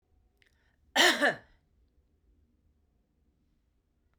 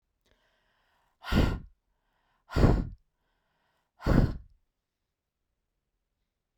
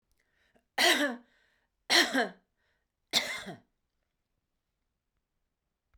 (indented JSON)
{
  "cough_length": "4.2 s",
  "cough_amplitude": 10096,
  "cough_signal_mean_std_ratio": 0.24,
  "exhalation_length": "6.6 s",
  "exhalation_amplitude": 12528,
  "exhalation_signal_mean_std_ratio": 0.29,
  "three_cough_length": "6.0 s",
  "three_cough_amplitude": 9908,
  "three_cough_signal_mean_std_ratio": 0.3,
  "survey_phase": "beta (2021-08-13 to 2022-03-07)",
  "age": "45-64",
  "gender": "Female",
  "wearing_mask": "No",
  "symptom_none": true,
  "symptom_onset": "6 days",
  "smoker_status": "Never smoked",
  "respiratory_condition_asthma": false,
  "respiratory_condition_other": false,
  "recruitment_source": "REACT",
  "submission_delay": "2 days",
  "covid_test_result": "Negative",
  "covid_test_method": "RT-qPCR"
}